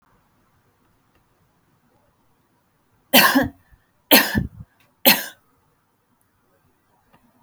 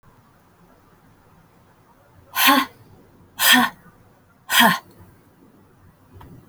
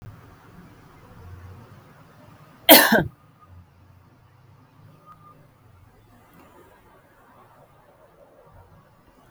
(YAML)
three_cough_length: 7.4 s
three_cough_amplitude: 32768
three_cough_signal_mean_std_ratio: 0.25
exhalation_length: 6.5 s
exhalation_amplitude: 31304
exhalation_signal_mean_std_ratio: 0.31
cough_length: 9.3 s
cough_amplitude: 32768
cough_signal_mean_std_ratio: 0.19
survey_phase: beta (2021-08-13 to 2022-03-07)
age: 65+
gender: Female
wearing_mask: 'No'
symptom_none: true
smoker_status: Never smoked
respiratory_condition_asthma: false
respiratory_condition_other: false
recruitment_source: REACT
submission_delay: 5 days
covid_test_result: Negative
covid_test_method: RT-qPCR